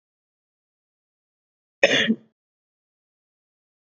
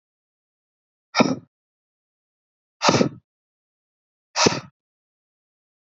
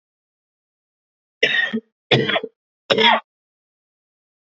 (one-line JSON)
{"cough_length": "3.8 s", "cough_amplitude": 27756, "cough_signal_mean_std_ratio": 0.21, "exhalation_length": "5.8 s", "exhalation_amplitude": 27787, "exhalation_signal_mean_std_ratio": 0.24, "three_cough_length": "4.4 s", "three_cough_amplitude": 29620, "three_cough_signal_mean_std_ratio": 0.35, "survey_phase": "beta (2021-08-13 to 2022-03-07)", "age": "18-44", "gender": "Male", "wearing_mask": "No", "symptom_cough_any": true, "symptom_shortness_of_breath": true, "symptom_sore_throat": true, "symptom_fatigue": true, "symptom_fever_high_temperature": true, "symptom_headache": true, "symptom_change_to_sense_of_smell_or_taste": true, "symptom_onset": "4 days", "smoker_status": "Never smoked", "respiratory_condition_asthma": false, "respiratory_condition_other": false, "recruitment_source": "Test and Trace", "submission_delay": "2 days", "covid_test_result": "Positive", "covid_test_method": "RT-qPCR", "covid_ct_value": 25.2, "covid_ct_gene": "ORF1ab gene"}